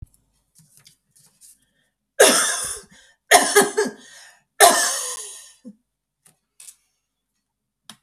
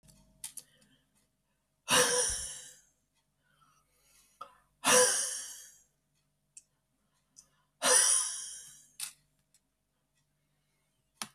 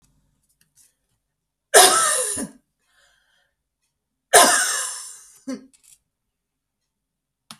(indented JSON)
{
  "three_cough_length": "8.0 s",
  "three_cough_amplitude": 32768,
  "three_cough_signal_mean_std_ratio": 0.32,
  "exhalation_length": "11.3 s",
  "exhalation_amplitude": 8916,
  "exhalation_signal_mean_std_ratio": 0.32,
  "cough_length": "7.6 s",
  "cough_amplitude": 32768,
  "cough_signal_mean_std_ratio": 0.29,
  "survey_phase": "beta (2021-08-13 to 2022-03-07)",
  "age": "65+",
  "gender": "Female",
  "wearing_mask": "No",
  "symptom_none": true,
  "smoker_status": "Never smoked",
  "respiratory_condition_asthma": false,
  "respiratory_condition_other": false,
  "recruitment_source": "REACT",
  "submission_delay": "1 day",
  "covid_test_result": "Negative",
  "covid_test_method": "RT-qPCR"
}